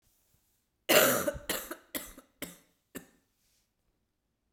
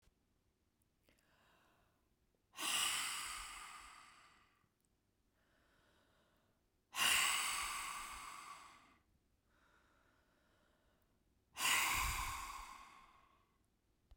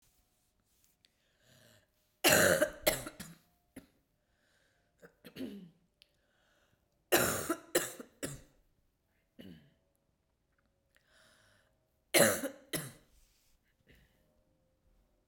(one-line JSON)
{"cough_length": "4.5 s", "cough_amplitude": 11920, "cough_signal_mean_std_ratio": 0.29, "exhalation_length": "14.2 s", "exhalation_amplitude": 2707, "exhalation_signal_mean_std_ratio": 0.4, "three_cough_length": "15.3 s", "three_cough_amplitude": 11712, "three_cough_signal_mean_std_ratio": 0.26, "survey_phase": "beta (2021-08-13 to 2022-03-07)", "age": "45-64", "gender": "Female", "wearing_mask": "No", "symptom_cough_any": true, "symptom_runny_or_blocked_nose": true, "symptom_sore_throat": true, "symptom_fatigue": true, "symptom_fever_high_temperature": true, "symptom_headache": true, "symptom_change_to_sense_of_smell_or_taste": true, "symptom_other": true, "symptom_onset": "4 days", "smoker_status": "Never smoked", "respiratory_condition_asthma": false, "respiratory_condition_other": false, "recruitment_source": "Test and Trace", "submission_delay": "2 days", "covid_test_result": "Positive", "covid_test_method": "RT-qPCR", "covid_ct_value": 16.5, "covid_ct_gene": "ORF1ab gene", "covid_ct_mean": 17.5, "covid_viral_load": "1900000 copies/ml", "covid_viral_load_category": "High viral load (>1M copies/ml)"}